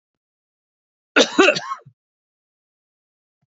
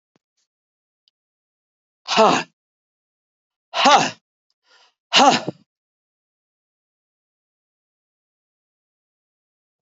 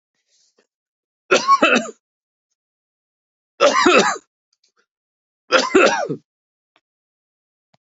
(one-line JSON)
{"cough_length": "3.6 s", "cough_amplitude": 31508, "cough_signal_mean_std_ratio": 0.24, "exhalation_length": "9.9 s", "exhalation_amplitude": 32383, "exhalation_signal_mean_std_ratio": 0.23, "three_cough_length": "7.9 s", "three_cough_amplitude": 31471, "three_cough_signal_mean_std_ratio": 0.35, "survey_phase": "beta (2021-08-13 to 2022-03-07)", "age": "65+", "gender": "Male", "wearing_mask": "No", "symptom_none": true, "smoker_status": "Never smoked", "respiratory_condition_asthma": false, "respiratory_condition_other": false, "recruitment_source": "REACT", "submission_delay": "2 days", "covid_test_result": "Negative", "covid_test_method": "RT-qPCR"}